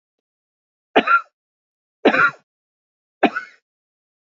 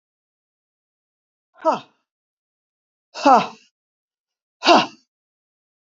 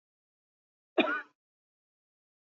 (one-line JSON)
{"three_cough_length": "4.3 s", "three_cough_amplitude": 27756, "three_cough_signal_mean_std_ratio": 0.28, "exhalation_length": "5.9 s", "exhalation_amplitude": 28619, "exhalation_signal_mean_std_ratio": 0.23, "cough_length": "2.6 s", "cough_amplitude": 8515, "cough_signal_mean_std_ratio": 0.21, "survey_phase": "beta (2021-08-13 to 2022-03-07)", "age": "65+", "gender": "Female", "wearing_mask": "No", "symptom_none": true, "smoker_status": "Ex-smoker", "respiratory_condition_asthma": false, "respiratory_condition_other": false, "recruitment_source": "REACT", "submission_delay": "1 day", "covid_test_result": "Negative", "covid_test_method": "RT-qPCR", "influenza_a_test_result": "Negative", "influenza_b_test_result": "Negative"}